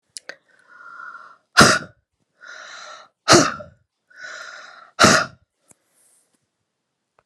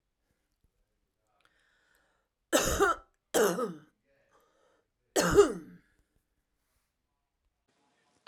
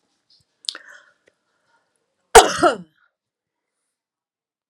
{"exhalation_length": "7.3 s", "exhalation_amplitude": 32768, "exhalation_signal_mean_std_ratio": 0.27, "three_cough_length": "8.3 s", "three_cough_amplitude": 11641, "three_cough_signal_mean_std_ratio": 0.28, "cough_length": "4.7 s", "cough_amplitude": 32768, "cough_signal_mean_std_ratio": 0.18, "survey_phase": "alpha (2021-03-01 to 2021-08-12)", "age": "45-64", "gender": "Female", "wearing_mask": "No", "symptom_none": true, "smoker_status": "Ex-smoker", "respiratory_condition_asthma": false, "respiratory_condition_other": false, "recruitment_source": "REACT", "submission_delay": "2 days", "covid_test_result": "Negative", "covid_test_method": "RT-qPCR"}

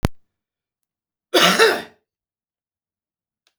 {"cough_length": "3.6 s", "cough_amplitude": 32768, "cough_signal_mean_std_ratio": 0.3, "survey_phase": "beta (2021-08-13 to 2022-03-07)", "age": "65+", "gender": "Male", "wearing_mask": "No", "symptom_cough_any": true, "symptom_runny_or_blocked_nose": true, "symptom_fatigue": true, "symptom_headache": true, "symptom_loss_of_taste": true, "symptom_onset": "8 days", "smoker_status": "Current smoker (e-cigarettes or vapes only)", "respiratory_condition_asthma": false, "respiratory_condition_other": false, "recruitment_source": "Test and Trace", "submission_delay": "2 days", "covid_test_result": "Positive", "covid_test_method": "RT-qPCR", "covid_ct_value": 26.0, "covid_ct_gene": "ORF1ab gene"}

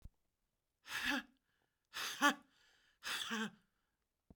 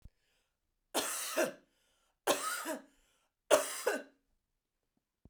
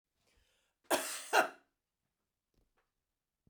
{"exhalation_length": "4.4 s", "exhalation_amplitude": 3993, "exhalation_signal_mean_std_ratio": 0.36, "three_cough_length": "5.3 s", "three_cough_amplitude": 10192, "three_cough_signal_mean_std_ratio": 0.37, "cough_length": "3.5 s", "cough_amplitude": 6240, "cough_signal_mean_std_ratio": 0.25, "survey_phase": "beta (2021-08-13 to 2022-03-07)", "age": "45-64", "gender": "Female", "wearing_mask": "No", "symptom_abdominal_pain": true, "symptom_fatigue": true, "smoker_status": "Prefer not to say", "respiratory_condition_asthma": false, "respiratory_condition_other": false, "recruitment_source": "REACT", "submission_delay": "1 day", "covid_test_result": "Negative", "covid_test_method": "RT-qPCR"}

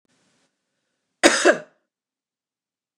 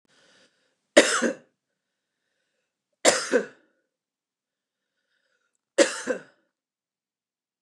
{"cough_length": "3.0 s", "cough_amplitude": 29204, "cough_signal_mean_std_ratio": 0.23, "three_cough_length": "7.6 s", "three_cough_amplitude": 29203, "three_cough_signal_mean_std_ratio": 0.24, "survey_phase": "beta (2021-08-13 to 2022-03-07)", "age": "45-64", "gender": "Female", "wearing_mask": "No", "symptom_none": true, "smoker_status": "Never smoked", "respiratory_condition_asthma": false, "respiratory_condition_other": false, "recruitment_source": "REACT", "submission_delay": "1 day", "covid_test_result": "Negative", "covid_test_method": "RT-qPCR", "influenza_a_test_result": "Negative", "influenza_b_test_result": "Negative"}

